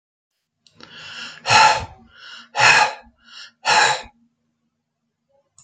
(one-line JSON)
{"exhalation_length": "5.6 s", "exhalation_amplitude": 29653, "exhalation_signal_mean_std_ratio": 0.37, "survey_phase": "alpha (2021-03-01 to 2021-08-12)", "age": "45-64", "gender": "Male", "wearing_mask": "No", "symptom_none": true, "smoker_status": "Never smoked", "respiratory_condition_asthma": false, "respiratory_condition_other": false, "recruitment_source": "REACT", "submission_delay": "1 day", "covid_test_result": "Negative", "covid_test_method": "RT-qPCR"}